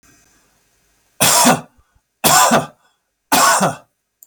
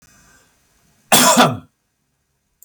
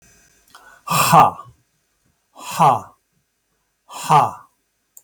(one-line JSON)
{"three_cough_length": "4.3 s", "three_cough_amplitude": 32767, "three_cough_signal_mean_std_ratio": 0.45, "cough_length": "2.6 s", "cough_amplitude": 32768, "cough_signal_mean_std_ratio": 0.33, "exhalation_length": "5.0 s", "exhalation_amplitude": 32768, "exhalation_signal_mean_std_ratio": 0.35, "survey_phase": "beta (2021-08-13 to 2022-03-07)", "age": "65+", "gender": "Male", "wearing_mask": "No", "symptom_none": true, "smoker_status": "Ex-smoker", "respiratory_condition_asthma": false, "respiratory_condition_other": false, "recruitment_source": "REACT", "submission_delay": "1 day", "covid_test_result": "Negative", "covid_test_method": "RT-qPCR"}